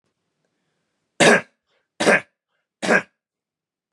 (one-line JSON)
{"three_cough_length": "3.9 s", "three_cough_amplitude": 30524, "three_cough_signal_mean_std_ratio": 0.29, "survey_phase": "beta (2021-08-13 to 2022-03-07)", "age": "18-44", "gender": "Male", "wearing_mask": "No", "symptom_cough_any": true, "symptom_sore_throat": true, "smoker_status": "Never smoked", "respiratory_condition_asthma": false, "respiratory_condition_other": false, "recruitment_source": "Test and Trace", "submission_delay": "2 days", "covid_test_result": "Positive", "covid_test_method": "RT-qPCR", "covid_ct_value": 29.8, "covid_ct_gene": "N gene"}